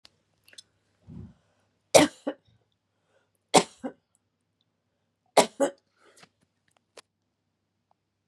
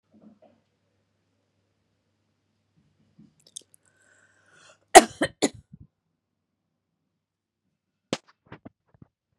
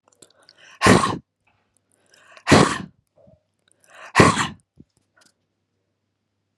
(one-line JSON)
{"three_cough_length": "8.3 s", "three_cough_amplitude": 27009, "three_cough_signal_mean_std_ratio": 0.17, "cough_length": "9.4 s", "cough_amplitude": 32768, "cough_signal_mean_std_ratio": 0.1, "exhalation_length": "6.6 s", "exhalation_amplitude": 32768, "exhalation_signal_mean_std_ratio": 0.28, "survey_phase": "beta (2021-08-13 to 2022-03-07)", "age": "45-64", "gender": "Female", "wearing_mask": "No", "symptom_none": true, "smoker_status": "Never smoked", "respiratory_condition_asthma": true, "respiratory_condition_other": false, "recruitment_source": "REACT", "submission_delay": "2 days", "covid_test_result": "Negative", "covid_test_method": "RT-qPCR", "influenza_a_test_result": "Negative", "influenza_b_test_result": "Negative"}